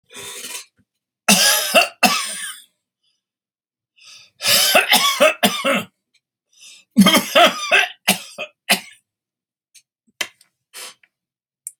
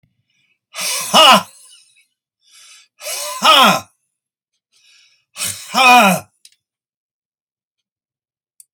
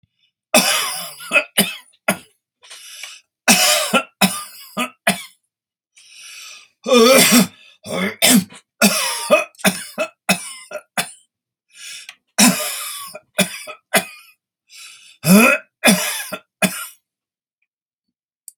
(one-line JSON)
{"three_cough_length": "11.8 s", "three_cough_amplitude": 32768, "three_cough_signal_mean_std_ratio": 0.41, "exhalation_length": "8.7 s", "exhalation_amplitude": 32768, "exhalation_signal_mean_std_ratio": 0.34, "cough_length": "18.6 s", "cough_amplitude": 32768, "cough_signal_mean_std_ratio": 0.42, "survey_phase": "alpha (2021-03-01 to 2021-08-12)", "age": "65+", "gender": "Male", "wearing_mask": "No", "symptom_cough_any": true, "symptom_onset": "12 days", "smoker_status": "Ex-smoker", "respiratory_condition_asthma": false, "respiratory_condition_other": false, "recruitment_source": "REACT", "submission_delay": "2 days", "covid_test_result": "Negative", "covid_test_method": "RT-qPCR"}